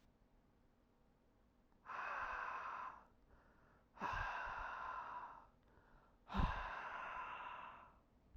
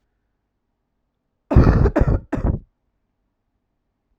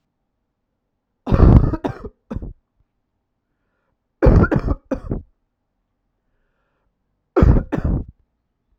{"exhalation_length": "8.4 s", "exhalation_amplitude": 1763, "exhalation_signal_mean_std_ratio": 0.6, "cough_length": "4.2 s", "cough_amplitude": 32768, "cough_signal_mean_std_ratio": 0.34, "three_cough_length": "8.8 s", "three_cough_amplitude": 32768, "three_cough_signal_mean_std_ratio": 0.33, "survey_phase": "alpha (2021-03-01 to 2021-08-12)", "age": "18-44", "gender": "Male", "wearing_mask": "No", "symptom_cough_any": true, "symptom_fatigue": true, "symptom_headache": true, "smoker_status": "Never smoked", "respiratory_condition_asthma": false, "respiratory_condition_other": false, "recruitment_source": "Test and Trace", "submission_delay": "2 days", "covid_test_result": "Positive", "covid_test_method": "RT-qPCR", "covid_ct_value": 12.5, "covid_ct_gene": "ORF1ab gene", "covid_ct_mean": 13.0, "covid_viral_load": "54000000 copies/ml", "covid_viral_load_category": "High viral load (>1M copies/ml)"}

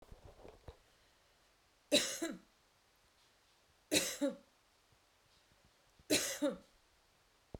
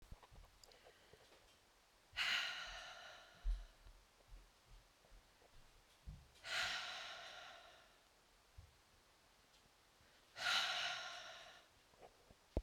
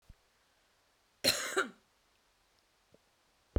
{"three_cough_length": "7.6 s", "three_cough_amplitude": 5305, "three_cough_signal_mean_std_ratio": 0.32, "exhalation_length": "12.6 s", "exhalation_amplitude": 2089, "exhalation_signal_mean_std_ratio": 0.45, "cough_length": "3.6 s", "cough_amplitude": 6847, "cough_signal_mean_std_ratio": 0.26, "survey_phase": "beta (2021-08-13 to 2022-03-07)", "age": "45-64", "gender": "Female", "wearing_mask": "No", "symptom_sore_throat": true, "symptom_fatigue": true, "symptom_headache": true, "symptom_change_to_sense_of_smell_or_taste": true, "symptom_loss_of_taste": true, "smoker_status": "Ex-smoker", "respiratory_condition_asthma": false, "respiratory_condition_other": false, "recruitment_source": "Test and Trace", "submission_delay": "2 days", "covid_test_result": "Positive", "covid_test_method": "RT-qPCR"}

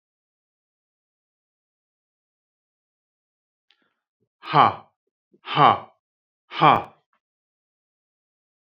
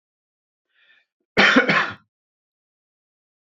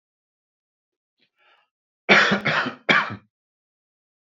{"exhalation_length": "8.8 s", "exhalation_amplitude": 27709, "exhalation_signal_mean_std_ratio": 0.2, "cough_length": "3.4 s", "cough_amplitude": 27942, "cough_signal_mean_std_ratio": 0.3, "three_cough_length": "4.4 s", "three_cough_amplitude": 26019, "three_cough_signal_mean_std_ratio": 0.32, "survey_phase": "beta (2021-08-13 to 2022-03-07)", "age": "45-64", "gender": "Male", "wearing_mask": "No", "symptom_none": true, "smoker_status": "Never smoked", "respiratory_condition_asthma": true, "respiratory_condition_other": false, "recruitment_source": "REACT", "submission_delay": "3 days", "covid_test_result": "Negative", "covid_test_method": "RT-qPCR", "influenza_a_test_result": "Negative", "influenza_b_test_result": "Negative"}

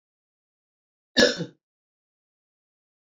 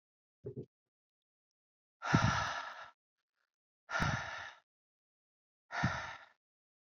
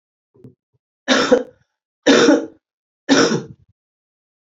{"cough_length": "3.2 s", "cough_amplitude": 23243, "cough_signal_mean_std_ratio": 0.19, "exhalation_length": "6.9 s", "exhalation_amplitude": 6561, "exhalation_signal_mean_std_ratio": 0.36, "three_cough_length": "4.5 s", "three_cough_amplitude": 28330, "three_cough_signal_mean_std_ratio": 0.38, "survey_phase": "beta (2021-08-13 to 2022-03-07)", "age": "18-44", "gender": "Female", "wearing_mask": "No", "symptom_cough_any": true, "symptom_runny_or_blocked_nose": true, "symptom_abdominal_pain": true, "symptom_fatigue": true, "symptom_change_to_sense_of_smell_or_taste": true, "symptom_loss_of_taste": true, "symptom_onset": "6 days", "smoker_status": "Ex-smoker", "respiratory_condition_asthma": false, "respiratory_condition_other": false, "recruitment_source": "Test and Trace", "submission_delay": "1 day", "covid_test_result": "Positive", "covid_test_method": "RT-qPCR", "covid_ct_value": 16.9, "covid_ct_gene": "ORF1ab gene", "covid_ct_mean": 17.4, "covid_viral_load": "2000000 copies/ml", "covid_viral_load_category": "High viral load (>1M copies/ml)"}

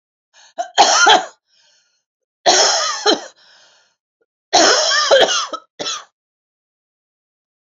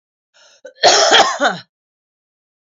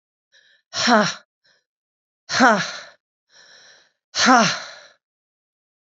{"three_cough_length": "7.7 s", "three_cough_amplitude": 32768, "three_cough_signal_mean_std_ratio": 0.44, "cough_length": "2.7 s", "cough_amplitude": 32205, "cough_signal_mean_std_ratio": 0.41, "exhalation_length": "6.0 s", "exhalation_amplitude": 28923, "exhalation_signal_mean_std_ratio": 0.34, "survey_phase": "beta (2021-08-13 to 2022-03-07)", "age": "45-64", "gender": "Female", "wearing_mask": "No", "symptom_cough_any": true, "symptom_runny_or_blocked_nose": true, "symptom_sore_throat": true, "symptom_abdominal_pain": true, "symptom_fatigue": true, "symptom_headache": true, "symptom_change_to_sense_of_smell_or_taste": true, "symptom_loss_of_taste": true, "smoker_status": "Never smoked", "respiratory_condition_asthma": false, "respiratory_condition_other": false, "recruitment_source": "Test and Trace", "submission_delay": "2 days", "covid_test_result": "Positive", "covid_test_method": "LFT"}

